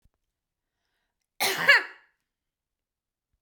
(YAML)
cough_length: 3.4 s
cough_amplitude: 17348
cough_signal_mean_std_ratio: 0.24
survey_phase: beta (2021-08-13 to 2022-03-07)
age: 45-64
gender: Female
wearing_mask: 'No'
symptom_none: true
smoker_status: Ex-smoker
respiratory_condition_asthma: false
respiratory_condition_other: false
recruitment_source: REACT
submission_delay: 3 days
covid_test_result: Negative
covid_test_method: RT-qPCR